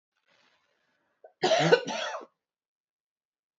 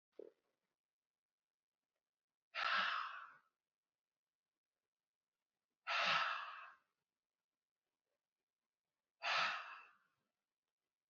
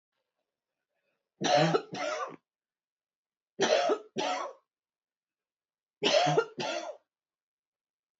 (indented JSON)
{
  "cough_length": "3.6 s",
  "cough_amplitude": 15077,
  "cough_signal_mean_std_ratio": 0.31,
  "exhalation_length": "11.1 s",
  "exhalation_amplitude": 1862,
  "exhalation_signal_mean_std_ratio": 0.32,
  "three_cough_length": "8.2 s",
  "three_cough_amplitude": 7687,
  "three_cough_signal_mean_std_ratio": 0.4,
  "survey_phase": "beta (2021-08-13 to 2022-03-07)",
  "age": "45-64",
  "gender": "Female",
  "wearing_mask": "No",
  "symptom_cough_any": true,
  "symptom_shortness_of_breath": true,
  "symptom_fatigue": true,
  "symptom_headache": true,
  "symptom_onset": "12 days",
  "smoker_status": "Never smoked",
  "respiratory_condition_asthma": false,
  "respiratory_condition_other": false,
  "recruitment_source": "REACT",
  "submission_delay": "2 days",
  "covid_test_result": "Negative",
  "covid_test_method": "RT-qPCR",
  "influenza_a_test_result": "Negative",
  "influenza_b_test_result": "Negative"
}